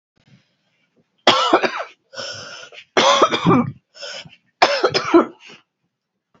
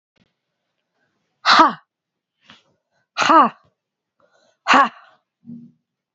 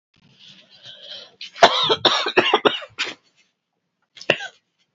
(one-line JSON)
{"three_cough_length": "6.4 s", "three_cough_amplitude": 31162, "three_cough_signal_mean_std_ratio": 0.42, "exhalation_length": "6.1 s", "exhalation_amplitude": 31621, "exhalation_signal_mean_std_ratio": 0.28, "cough_length": "4.9 s", "cough_amplitude": 32767, "cough_signal_mean_std_ratio": 0.35, "survey_phase": "beta (2021-08-13 to 2022-03-07)", "age": "45-64", "gender": "Female", "wearing_mask": "No", "symptom_cough_any": true, "symptom_runny_or_blocked_nose": true, "symptom_sore_throat": true, "symptom_fatigue": true, "symptom_headache": true, "symptom_loss_of_taste": true, "symptom_onset": "4 days", "smoker_status": "Ex-smoker", "respiratory_condition_asthma": false, "respiratory_condition_other": false, "recruitment_source": "Test and Trace", "submission_delay": "2 days", "covid_test_result": "Positive", "covid_test_method": "RT-qPCR", "covid_ct_value": 23.4, "covid_ct_gene": "N gene"}